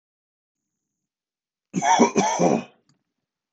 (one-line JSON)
{"cough_length": "3.5 s", "cough_amplitude": 23706, "cough_signal_mean_std_ratio": 0.37, "survey_phase": "beta (2021-08-13 to 2022-03-07)", "age": "65+", "gender": "Male", "wearing_mask": "No", "symptom_none": true, "smoker_status": "Ex-smoker", "respiratory_condition_asthma": false, "respiratory_condition_other": false, "recruitment_source": "REACT", "submission_delay": "1 day", "covid_test_result": "Negative", "covid_test_method": "RT-qPCR", "influenza_a_test_result": "Negative", "influenza_b_test_result": "Negative"}